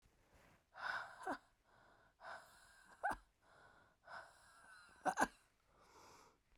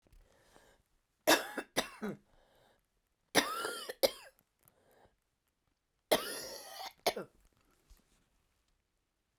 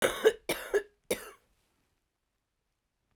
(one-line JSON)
{"exhalation_length": "6.6 s", "exhalation_amplitude": 2915, "exhalation_signal_mean_std_ratio": 0.34, "three_cough_length": "9.4 s", "three_cough_amplitude": 8572, "three_cough_signal_mean_std_ratio": 0.27, "cough_length": "3.2 s", "cough_amplitude": 11843, "cough_signal_mean_std_ratio": 0.29, "survey_phase": "beta (2021-08-13 to 2022-03-07)", "age": "45-64", "gender": "Female", "wearing_mask": "No", "symptom_cough_any": true, "symptom_runny_or_blocked_nose": true, "symptom_shortness_of_breath": true, "symptom_sore_throat": true, "symptom_fatigue": true, "symptom_fever_high_temperature": true, "symptom_headache": true, "symptom_change_to_sense_of_smell_or_taste": true, "smoker_status": "Ex-smoker", "respiratory_condition_asthma": false, "respiratory_condition_other": false, "recruitment_source": "Test and Trace", "submission_delay": "2 days", "covid_test_result": "Positive", "covid_test_method": "RT-qPCR", "covid_ct_value": 27.5, "covid_ct_gene": "ORF1ab gene"}